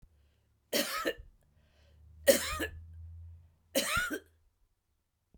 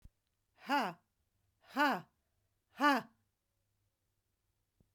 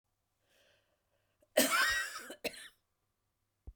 {"three_cough_length": "5.4 s", "three_cough_amplitude": 11166, "three_cough_signal_mean_std_ratio": 0.37, "exhalation_length": "4.9 s", "exhalation_amplitude": 4947, "exhalation_signal_mean_std_ratio": 0.28, "cough_length": "3.8 s", "cough_amplitude": 7226, "cough_signal_mean_std_ratio": 0.34, "survey_phase": "beta (2021-08-13 to 2022-03-07)", "age": "65+", "gender": "Female", "wearing_mask": "No", "symptom_none": true, "smoker_status": "Ex-smoker", "respiratory_condition_asthma": false, "respiratory_condition_other": false, "recruitment_source": "REACT", "submission_delay": "1 day", "covid_test_result": "Negative", "covid_test_method": "RT-qPCR"}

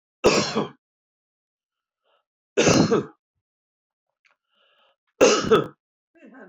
{"three_cough_length": "6.5 s", "three_cough_amplitude": 24619, "three_cough_signal_mean_std_ratio": 0.34, "survey_phase": "beta (2021-08-13 to 2022-03-07)", "age": "65+", "gender": "Male", "wearing_mask": "No", "symptom_runny_or_blocked_nose": true, "symptom_onset": "7 days", "smoker_status": "Ex-smoker", "respiratory_condition_asthma": false, "respiratory_condition_other": false, "recruitment_source": "Test and Trace", "submission_delay": "2 days", "covid_test_result": "Positive", "covid_test_method": "RT-qPCR", "covid_ct_value": 25.3, "covid_ct_gene": "ORF1ab gene"}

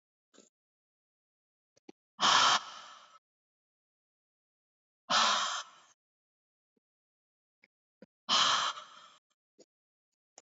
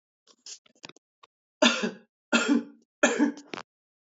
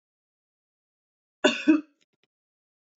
{"exhalation_length": "10.4 s", "exhalation_amplitude": 9267, "exhalation_signal_mean_std_ratio": 0.29, "three_cough_length": "4.2 s", "three_cough_amplitude": 18029, "three_cough_signal_mean_std_ratio": 0.36, "cough_length": "3.0 s", "cough_amplitude": 13805, "cough_signal_mean_std_ratio": 0.22, "survey_phase": "beta (2021-08-13 to 2022-03-07)", "age": "18-44", "gender": "Female", "wearing_mask": "No", "symptom_none": true, "symptom_onset": "4 days", "smoker_status": "Never smoked", "respiratory_condition_asthma": false, "respiratory_condition_other": false, "recruitment_source": "REACT", "submission_delay": "3 days", "covid_test_result": "Negative", "covid_test_method": "RT-qPCR", "influenza_a_test_result": "Negative", "influenza_b_test_result": "Negative"}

